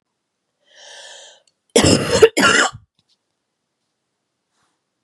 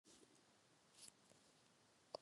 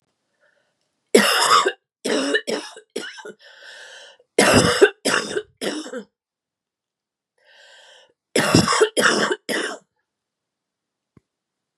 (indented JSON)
{
  "cough_length": "5.0 s",
  "cough_amplitude": 32768,
  "cough_signal_mean_std_ratio": 0.31,
  "exhalation_length": "2.2 s",
  "exhalation_amplitude": 726,
  "exhalation_signal_mean_std_ratio": 0.42,
  "three_cough_length": "11.8 s",
  "three_cough_amplitude": 32692,
  "three_cough_signal_mean_std_ratio": 0.41,
  "survey_phase": "beta (2021-08-13 to 2022-03-07)",
  "age": "45-64",
  "gender": "Female",
  "wearing_mask": "No",
  "symptom_none": true,
  "smoker_status": "Ex-smoker",
  "respiratory_condition_asthma": false,
  "respiratory_condition_other": false,
  "recruitment_source": "REACT",
  "submission_delay": "3 days",
  "covid_test_result": "Negative",
  "covid_test_method": "RT-qPCR",
  "influenza_a_test_result": "Negative",
  "influenza_b_test_result": "Negative"
}